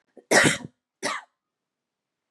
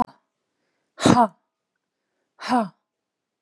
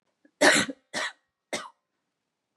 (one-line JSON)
{"cough_length": "2.3 s", "cough_amplitude": 20147, "cough_signal_mean_std_ratio": 0.31, "exhalation_length": "3.4 s", "exhalation_amplitude": 32768, "exhalation_signal_mean_std_ratio": 0.27, "three_cough_length": "2.6 s", "three_cough_amplitude": 17381, "three_cough_signal_mean_std_ratio": 0.31, "survey_phase": "beta (2021-08-13 to 2022-03-07)", "age": "18-44", "gender": "Female", "wearing_mask": "No", "symptom_none": true, "smoker_status": "Ex-smoker", "respiratory_condition_asthma": false, "respiratory_condition_other": false, "recruitment_source": "REACT", "submission_delay": "1 day", "covid_test_result": "Negative", "covid_test_method": "RT-qPCR"}